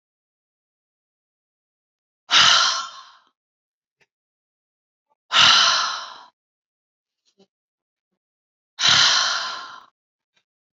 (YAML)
exhalation_length: 10.8 s
exhalation_amplitude: 29403
exhalation_signal_mean_std_ratio: 0.33
survey_phase: beta (2021-08-13 to 2022-03-07)
age: 45-64
gender: Female
wearing_mask: 'No'
symptom_none: true
smoker_status: Ex-smoker
respiratory_condition_asthma: false
respiratory_condition_other: false
recruitment_source: REACT
submission_delay: 1 day
covid_test_result: Negative
covid_test_method: RT-qPCR
influenza_a_test_result: Negative
influenza_b_test_result: Negative